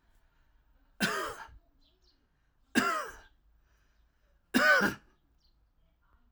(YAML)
three_cough_length: 6.3 s
three_cough_amplitude: 8948
three_cough_signal_mean_std_ratio: 0.32
survey_phase: alpha (2021-03-01 to 2021-08-12)
age: 45-64
gender: Male
wearing_mask: 'No'
symptom_cough_any: true
symptom_fatigue: true
symptom_headache: true
symptom_onset: 3 days
smoker_status: Never smoked
respiratory_condition_asthma: false
respiratory_condition_other: false
recruitment_source: Test and Trace
submission_delay: 2 days
covid_test_result: Positive
covid_test_method: RT-qPCR
covid_ct_value: 23.3
covid_ct_gene: ORF1ab gene
covid_ct_mean: 24.3
covid_viral_load: 11000 copies/ml
covid_viral_load_category: Low viral load (10K-1M copies/ml)